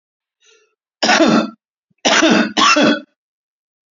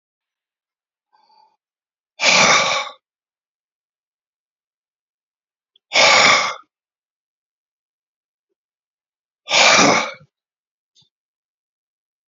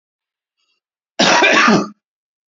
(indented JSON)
{
  "three_cough_length": "3.9 s",
  "three_cough_amplitude": 30790,
  "three_cough_signal_mean_std_ratio": 0.5,
  "exhalation_length": "12.3 s",
  "exhalation_amplitude": 32768,
  "exhalation_signal_mean_std_ratio": 0.3,
  "cough_length": "2.5 s",
  "cough_amplitude": 30732,
  "cough_signal_mean_std_ratio": 0.44,
  "survey_phase": "beta (2021-08-13 to 2022-03-07)",
  "age": "45-64",
  "gender": "Male",
  "wearing_mask": "No",
  "symptom_none": true,
  "smoker_status": "Current smoker (11 or more cigarettes per day)",
  "respiratory_condition_asthma": false,
  "respiratory_condition_other": false,
  "recruitment_source": "REACT",
  "submission_delay": "2 days",
  "covid_test_result": "Negative",
  "covid_test_method": "RT-qPCR"
}